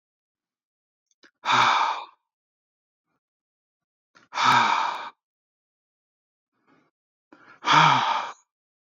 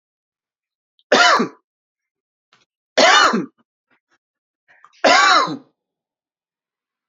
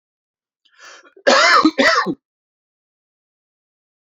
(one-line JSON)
{"exhalation_length": "8.9 s", "exhalation_amplitude": 19750, "exhalation_signal_mean_std_ratio": 0.35, "three_cough_length": "7.1 s", "three_cough_amplitude": 29671, "three_cough_signal_mean_std_ratio": 0.35, "cough_length": "4.1 s", "cough_amplitude": 28542, "cough_signal_mean_std_ratio": 0.36, "survey_phase": "beta (2021-08-13 to 2022-03-07)", "age": "45-64", "gender": "Male", "wearing_mask": "No", "symptom_none": true, "smoker_status": "Never smoked", "respiratory_condition_asthma": false, "respiratory_condition_other": false, "recruitment_source": "REACT", "submission_delay": "1 day", "covid_test_result": "Negative", "covid_test_method": "RT-qPCR", "influenza_a_test_result": "Negative", "influenza_b_test_result": "Negative"}